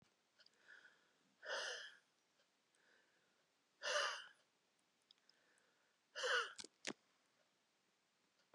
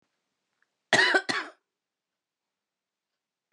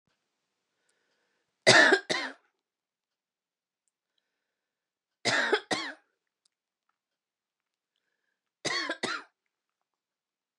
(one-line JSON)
{"exhalation_length": "8.5 s", "exhalation_amplitude": 1507, "exhalation_signal_mean_std_ratio": 0.32, "cough_length": "3.5 s", "cough_amplitude": 14063, "cough_signal_mean_std_ratio": 0.26, "three_cough_length": "10.6 s", "three_cough_amplitude": 19425, "three_cough_signal_mean_std_ratio": 0.24, "survey_phase": "beta (2021-08-13 to 2022-03-07)", "age": "18-44", "gender": "Female", "wearing_mask": "No", "symptom_none": true, "smoker_status": "Never smoked", "respiratory_condition_asthma": false, "respiratory_condition_other": false, "recruitment_source": "REACT", "submission_delay": "2 days", "covid_test_result": "Negative", "covid_test_method": "RT-qPCR", "influenza_a_test_result": "Negative", "influenza_b_test_result": "Negative"}